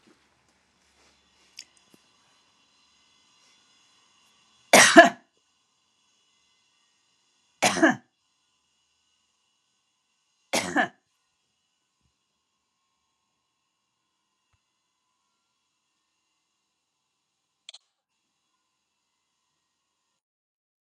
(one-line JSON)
{"three_cough_length": "20.8 s", "three_cough_amplitude": 32768, "three_cough_signal_mean_std_ratio": 0.14, "survey_phase": "alpha (2021-03-01 to 2021-08-12)", "age": "65+", "gender": "Female", "wearing_mask": "No", "symptom_none": true, "smoker_status": "Ex-smoker", "respiratory_condition_asthma": false, "respiratory_condition_other": false, "recruitment_source": "REACT", "submission_delay": "3 days", "covid_test_result": "Negative", "covid_test_method": "RT-qPCR"}